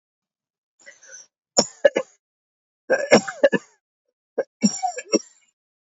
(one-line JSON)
{"three_cough_length": "5.9 s", "three_cough_amplitude": 30907, "three_cough_signal_mean_std_ratio": 0.28, "survey_phase": "beta (2021-08-13 to 2022-03-07)", "age": "45-64", "gender": "Male", "wearing_mask": "Yes", "symptom_none": true, "smoker_status": "Never smoked", "respiratory_condition_asthma": false, "respiratory_condition_other": false, "recruitment_source": "REACT", "submission_delay": "1 day", "covid_test_result": "Negative", "covid_test_method": "RT-qPCR", "influenza_a_test_result": "Unknown/Void", "influenza_b_test_result": "Unknown/Void"}